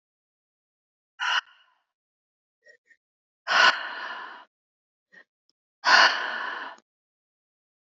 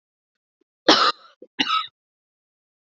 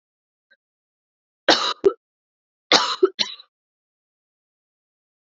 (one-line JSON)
{"exhalation_length": "7.9 s", "exhalation_amplitude": 21889, "exhalation_signal_mean_std_ratio": 0.3, "cough_length": "2.9 s", "cough_amplitude": 28299, "cough_signal_mean_std_ratio": 0.29, "three_cough_length": "5.4 s", "three_cough_amplitude": 30220, "three_cough_signal_mean_std_ratio": 0.24, "survey_phase": "beta (2021-08-13 to 2022-03-07)", "age": "45-64", "gender": "Female", "wearing_mask": "No", "symptom_new_continuous_cough": true, "symptom_fatigue": true, "symptom_fever_high_temperature": true, "symptom_headache": true, "symptom_other": true, "symptom_onset": "2 days", "smoker_status": "Never smoked", "respiratory_condition_asthma": false, "respiratory_condition_other": false, "recruitment_source": "Test and Trace", "submission_delay": "1 day", "covid_test_result": "Positive", "covid_test_method": "RT-qPCR", "covid_ct_value": 24.1, "covid_ct_gene": "ORF1ab gene", "covid_ct_mean": 24.3, "covid_viral_load": "11000 copies/ml", "covid_viral_load_category": "Low viral load (10K-1M copies/ml)"}